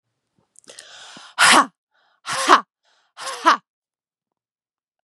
{"exhalation_length": "5.0 s", "exhalation_amplitude": 32768, "exhalation_signal_mean_std_ratio": 0.29, "survey_phase": "beta (2021-08-13 to 2022-03-07)", "age": "45-64", "gender": "Female", "wearing_mask": "No", "symptom_none": true, "symptom_onset": "4 days", "smoker_status": "Never smoked", "respiratory_condition_asthma": false, "respiratory_condition_other": false, "recruitment_source": "REACT", "submission_delay": "3 days", "covid_test_result": "Negative", "covid_test_method": "RT-qPCR", "influenza_a_test_result": "Negative", "influenza_b_test_result": "Negative"}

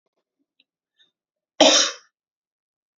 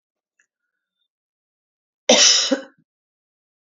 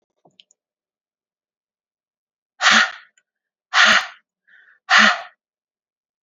{"cough_length": "3.0 s", "cough_amplitude": 30576, "cough_signal_mean_std_ratio": 0.24, "three_cough_length": "3.8 s", "three_cough_amplitude": 30033, "three_cough_signal_mean_std_ratio": 0.27, "exhalation_length": "6.2 s", "exhalation_amplitude": 32023, "exhalation_signal_mean_std_ratio": 0.29, "survey_phase": "beta (2021-08-13 to 2022-03-07)", "age": "45-64", "gender": "Female", "wearing_mask": "No", "symptom_none": true, "smoker_status": "Never smoked", "respiratory_condition_asthma": false, "respiratory_condition_other": false, "recruitment_source": "REACT", "submission_delay": "1 day", "covid_test_result": "Negative", "covid_test_method": "RT-qPCR", "influenza_a_test_result": "Negative", "influenza_b_test_result": "Negative"}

